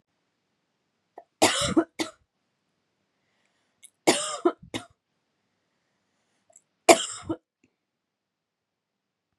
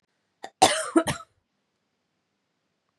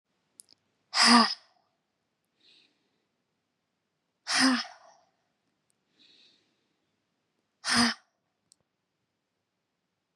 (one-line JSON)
{"three_cough_length": "9.4 s", "three_cough_amplitude": 31107, "three_cough_signal_mean_std_ratio": 0.22, "cough_length": "3.0 s", "cough_amplitude": 22777, "cough_signal_mean_std_ratio": 0.26, "exhalation_length": "10.2 s", "exhalation_amplitude": 16245, "exhalation_signal_mean_std_ratio": 0.24, "survey_phase": "beta (2021-08-13 to 2022-03-07)", "age": "18-44", "gender": "Female", "wearing_mask": "No", "symptom_runny_or_blocked_nose": true, "symptom_headache": true, "symptom_onset": "4 days", "smoker_status": "Never smoked", "respiratory_condition_asthma": false, "respiratory_condition_other": false, "recruitment_source": "Test and Trace", "submission_delay": "2 days", "covid_test_result": "Positive", "covid_test_method": "RT-qPCR"}